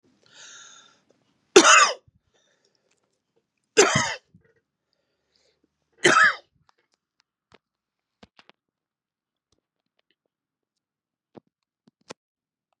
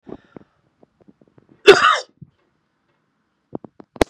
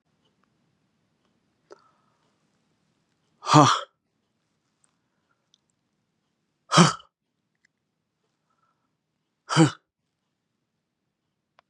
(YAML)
three_cough_length: 12.8 s
three_cough_amplitude: 32768
three_cough_signal_mean_std_ratio: 0.21
cough_length: 4.1 s
cough_amplitude: 32768
cough_signal_mean_std_ratio: 0.21
exhalation_length: 11.7 s
exhalation_amplitude: 32357
exhalation_signal_mean_std_ratio: 0.18
survey_phase: beta (2021-08-13 to 2022-03-07)
age: 45-64
gender: Male
wearing_mask: 'No'
symptom_shortness_of_breath: true
symptom_fatigue: true
symptom_onset: 13 days
smoker_status: Never smoked
respiratory_condition_asthma: true
respiratory_condition_other: false
recruitment_source: REACT
submission_delay: 2 days
covid_test_result: Negative
covid_test_method: RT-qPCR
influenza_a_test_result: Negative
influenza_b_test_result: Negative